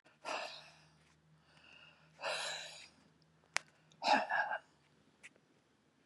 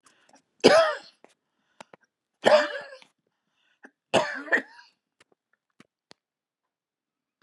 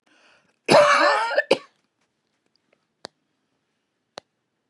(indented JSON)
{
  "exhalation_length": "6.1 s",
  "exhalation_amplitude": 9734,
  "exhalation_signal_mean_std_ratio": 0.36,
  "three_cough_length": "7.4 s",
  "three_cough_amplitude": 26696,
  "three_cough_signal_mean_std_ratio": 0.26,
  "cough_length": "4.7 s",
  "cough_amplitude": 27120,
  "cough_signal_mean_std_ratio": 0.32,
  "survey_phase": "beta (2021-08-13 to 2022-03-07)",
  "age": "65+",
  "gender": "Female",
  "wearing_mask": "No",
  "symptom_none": true,
  "smoker_status": "Never smoked",
  "respiratory_condition_asthma": false,
  "respiratory_condition_other": false,
  "recruitment_source": "REACT",
  "submission_delay": "2 days",
  "covid_test_result": "Negative",
  "covid_test_method": "RT-qPCR",
  "influenza_a_test_result": "Negative",
  "influenza_b_test_result": "Negative"
}